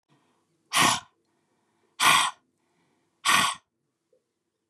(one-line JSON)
{"exhalation_length": "4.7 s", "exhalation_amplitude": 17624, "exhalation_signal_mean_std_ratio": 0.33, "survey_phase": "beta (2021-08-13 to 2022-03-07)", "age": "45-64", "gender": "Female", "wearing_mask": "No", "symptom_headache": true, "smoker_status": "Ex-smoker", "respiratory_condition_asthma": false, "respiratory_condition_other": false, "recruitment_source": "REACT", "submission_delay": "2 days", "covid_test_result": "Negative", "covid_test_method": "RT-qPCR", "influenza_a_test_result": "Negative", "influenza_b_test_result": "Negative"}